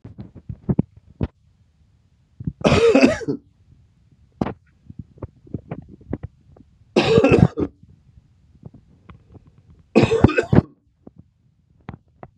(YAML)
three_cough_length: 12.4 s
three_cough_amplitude: 32768
three_cough_signal_mean_std_ratio: 0.33
survey_phase: beta (2021-08-13 to 2022-03-07)
age: 65+
gender: Male
wearing_mask: 'No'
symptom_runny_or_blocked_nose: true
smoker_status: Ex-smoker
respiratory_condition_asthma: false
respiratory_condition_other: false
recruitment_source: Test and Trace
submission_delay: 2 days
covid_test_result: Positive
covid_test_method: LFT